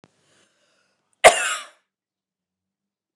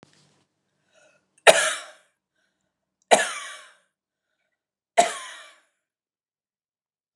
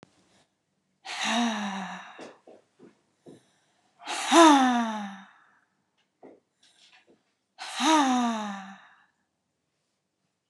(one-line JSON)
{"cough_length": "3.2 s", "cough_amplitude": 29204, "cough_signal_mean_std_ratio": 0.19, "three_cough_length": "7.2 s", "three_cough_amplitude": 29204, "three_cough_signal_mean_std_ratio": 0.21, "exhalation_length": "10.5 s", "exhalation_amplitude": 19403, "exhalation_signal_mean_std_ratio": 0.35, "survey_phase": "beta (2021-08-13 to 2022-03-07)", "age": "45-64", "gender": "Female", "wearing_mask": "No", "symptom_cough_any": true, "symptom_runny_or_blocked_nose": true, "symptom_shortness_of_breath": true, "symptom_fatigue": true, "symptom_fever_high_temperature": true, "symptom_headache": true, "symptom_onset": "3 days", "smoker_status": "Never smoked", "respiratory_condition_asthma": true, "respiratory_condition_other": false, "recruitment_source": "REACT", "submission_delay": "0 days", "covid_test_result": "Negative", "covid_test_method": "RT-qPCR"}